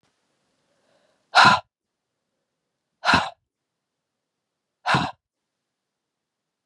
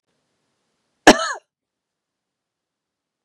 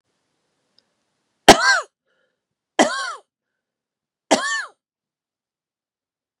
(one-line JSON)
{"exhalation_length": "6.7 s", "exhalation_amplitude": 26902, "exhalation_signal_mean_std_ratio": 0.23, "cough_length": "3.2 s", "cough_amplitude": 32768, "cough_signal_mean_std_ratio": 0.15, "three_cough_length": "6.4 s", "three_cough_amplitude": 32768, "three_cough_signal_mean_std_ratio": 0.23, "survey_phase": "beta (2021-08-13 to 2022-03-07)", "age": "65+", "gender": "Female", "wearing_mask": "No", "symptom_none": true, "smoker_status": "Never smoked", "respiratory_condition_asthma": false, "respiratory_condition_other": false, "recruitment_source": "REACT", "submission_delay": "1 day", "covid_test_result": "Negative", "covid_test_method": "RT-qPCR"}